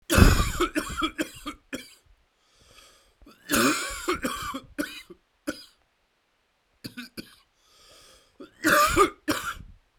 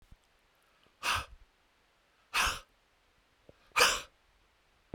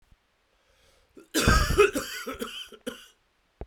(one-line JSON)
{"three_cough_length": "10.0 s", "three_cough_amplitude": 32767, "three_cough_signal_mean_std_ratio": 0.39, "exhalation_length": "4.9 s", "exhalation_amplitude": 10083, "exhalation_signal_mean_std_ratio": 0.29, "cough_length": "3.7 s", "cough_amplitude": 15398, "cough_signal_mean_std_ratio": 0.39, "survey_phase": "beta (2021-08-13 to 2022-03-07)", "age": "45-64", "gender": "Male", "wearing_mask": "No", "symptom_cough_any": true, "symptom_new_continuous_cough": true, "symptom_runny_or_blocked_nose": true, "symptom_sore_throat": true, "symptom_fatigue": true, "symptom_fever_high_temperature": true, "symptom_headache": true, "symptom_change_to_sense_of_smell_or_taste": true, "symptom_loss_of_taste": true, "symptom_onset": "4 days", "smoker_status": "Current smoker (1 to 10 cigarettes per day)", "respiratory_condition_asthma": false, "respiratory_condition_other": false, "recruitment_source": "Test and Trace", "submission_delay": "2 days", "covid_test_result": "Positive", "covid_test_method": "RT-qPCR"}